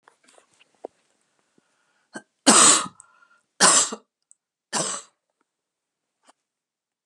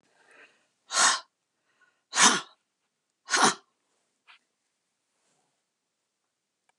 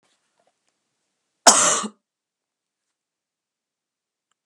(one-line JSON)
{"three_cough_length": "7.1 s", "three_cough_amplitude": 30918, "three_cough_signal_mean_std_ratio": 0.26, "exhalation_length": "6.8 s", "exhalation_amplitude": 23208, "exhalation_signal_mean_std_ratio": 0.25, "cough_length": "4.5 s", "cough_amplitude": 32768, "cough_signal_mean_std_ratio": 0.2, "survey_phase": "beta (2021-08-13 to 2022-03-07)", "age": "65+", "gender": "Female", "wearing_mask": "No", "symptom_shortness_of_breath": true, "symptom_other": true, "symptom_onset": "12 days", "smoker_status": "Never smoked", "respiratory_condition_asthma": false, "respiratory_condition_other": true, "recruitment_source": "REACT", "submission_delay": "3 days", "covid_test_result": "Negative", "covid_test_method": "RT-qPCR"}